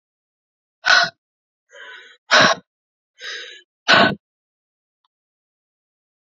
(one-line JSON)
{"exhalation_length": "6.4 s", "exhalation_amplitude": 30288, "exhalation_signal_mean_std_ratio": 0.28, "survey_phase": "beta (2021-08-13 to 2022-03-07)", "age": "18-44", "gender": "Female", "wearing_mask": "No", "symptom_cough_any": true, "symptom_runny_or_blocked_nose": true, "symptom_shortness_of_breath": true, "symptom_sore_throat": true, "symptom_fatigue": true, "symptom_headache": true, "smoker_status": "Never smoked", "respiratory_condition_asthma": true, "respiratory_condition_other": false, "recruitment_source": "Test and Trace", "submission_delay": "1 day", "covid_test_result": "Positive", "covid_test_method": "RT-qPCR", "covid_ct_value": 29.2, "covid_ct_gene": "N gene"}